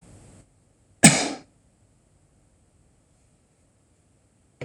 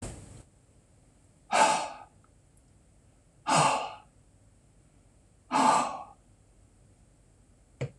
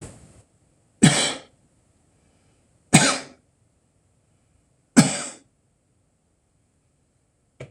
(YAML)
cough_length: 4.6 s
cough_amplitude: 26028
cough_signal_mean_std_ratio: 0.17
exhalation_length: 8.0 s
exhalation_amplitude: 11227
exhalation_signal_mean_std_ratio: 0.35
three_cough_length: 7.7 s
three_cough_amplitude: 26028
three_cough_signal_mean_std_ratio: 0.23
survey_phase: beta (2021-08-13 to 2022-03-07)
age: 65+
gender: Male
wearing_mask: 'No'
symptom_none: true
symptom_onset: 12 days
smoker_status: Never smoked
respiratory_condition_asthma: false
respiratory_condition_other: false
recruitment_source: REACT
submission_delay: 4 days
covid_test_result: Negative
covid_test_method: RT-qPCR
influenza_a_test_result: Negative
influenza_b_test_result: Negative